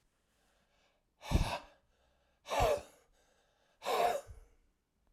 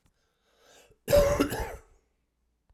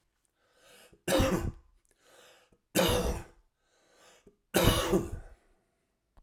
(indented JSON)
{
  "exhalation_length": "5.1 s",
  "exhalation_amplitude": 4090,
  "exhalation_signal_mean_std_ratio": 0.36,
  "cough_length": "2.7 s",
  "cough_amplitude": 11190,
  "cough_signal_mean_std_ratio": 0.35,
  "three_cough_length": "6.2 s",
  "three_cough_amplitude": 11138,
  "three_cough_signal_mean_std_ratio": 0.4,
  "survey_phase": "alpha (2021-03-01 to 2021-08-12)",
  "age": "65+",
  "gender": "Male",
  "wearing_mask": "No",
  "symptom_cough_any": true,
  "symptom_fatigue": true,
  "symptom_onset": "4 days",
  "smoker_status": "Never smoked",
  "respiratory_condition_asthma": false,
  "respiratory_condition_other": false,
  "recruitment_source": "Test and Trace",
  "submission_delay": "1 day",
  "covid_test_result": "Positive",
  "covid_test_method": "RT-qPCR"
}